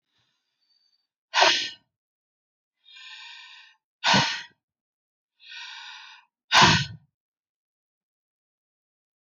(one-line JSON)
{"exhalation_length": "9.2 s", "exhalation_amplitude": 22358, "exhalation_signal_mean_std_ratio": 0.27, "survey_phase": "alpha (2021-03-01 to 2021-08-12)", "age": "45-64", "gender": "Female", "wearing_mask": "No", "symptom_none": true, "smoker_status": "Ex-smoker", "respiratory_condition_asthma": true, "respiratory_condition_other": false, "recruitment_source": "REACT", "submission_delay": "1 day", "covid_test_result": "Negative", "covid_test_method": "RT-qPCR"}